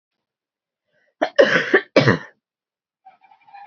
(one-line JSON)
{"cough_length": "3.7 s", "cough_amplitude": 28134, "cough_signal_mean_std_ratio": 0.31, "survey_phase": "beta (2021-08-13 to 2022-03-07)", "age": "45-64", "gender": "Female", "wearing_mask": "No", "symptom_cough_any": true, "symptom_runny_or_blocked_nose": true, "symptom_fatigue": true, "symptom_headache": true, "symptom_change_to_sense_of_smell_or_taste": true, "symptom_loss_of_taste": true, "symptom_other": true, "symptom_onset": "4 days", "smoker_status": "Never smoked", "respiratory_condition_asthma": false, "respiratory_condition_other": false, "recruitment_source": "Test and Trace", "submission_delay": "2 days", "covid_test_result": "Positive", "covid_test_method": "RT-qPCR", "covid_ct_value": 19.0, "covid_ct_gene": "ORF1ab gene"}